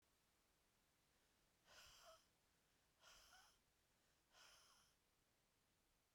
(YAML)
exhalation_length: 6.1 s
exhalation_amplitude: 56
exhalation_signal_mean_std_ratio: 0.68
survey_phase: beta (2021-08-13 to 2022-03-07)
age: 45-64
gender: Female
wearing_mask: 'No'
symptom_cough_any: true
symptom_runny_or_blocked_nose: true
symptom_sore_throat: true
symptom_diarrhoea: true
symptom_fatigue: true
smoker_status: Ex-smoker
respiratory_condition_asthma: false
respiratory_condition_other: false
recruitment_source: Test and Trace
submission_delay: 1 day
covid_test_result: Positive
covid_test_method: RT-qPCR
covid_ct_value: 19.1
covid_ct_gene: ORF1ab gene